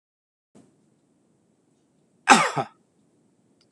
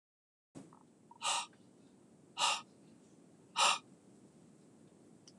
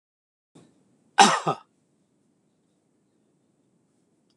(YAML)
three_cough_length: 3.7 s
three_cough_amplitude: 26028
three_cough_signal_mean_std_ratio: 0.2
exhalation_length: 5.4 s
exhalation_amplitude: 4661
exhalation_signal_mean_std_ratio: 0.33
cough_length: 4.4 s
cough_amplitude: 26021
cough_signal_mean_std_ratio: 0.18
survey_phase: alpha (2021-03-01 to 2021-08-12)
age: 65+
gender: Male
wearing_mask: 'No'
symptom_none: true
smoker_status: Ex-smoker
respiratory_condition_asthma: false
respiratory_condition_other: false
recruitment_source: REACT
submission_delay: 1 day
covid_test_result: Negative
covid_test_method: RT-qPCR